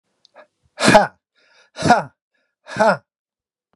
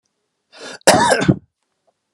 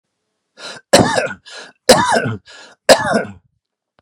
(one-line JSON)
{"exhalation_length": "3.8 s", "exhalation_amplitude": 32768, "exhalation_signal_mean_std_ratio": 0.32, "cough_length": "2.1 s", "cough_amplitude": 32768, "cough_signal_mean_std_ratio": 0.38, "three_cough_length": "4.0 s", "three_cough_amplitude": 32768, "three_cough_signal_mean_std_ratio": 0.41, "survey_phase": "beta (2021-08-13 to 2022-03-07)", "age": "65+", "gender": "Male", "wearing_mask": "No", "symptom_none": true, "symptom_onset": "11 days", "smoker_status": "Ex-smoker", "respiratory_condition_asthma": false, "respiratory_condition_other": false, "recruitment_source": "REACT", "submission_delay": "1 day", "covid_test_result": "Negative", "covid_test_method": "RT-qPCR"}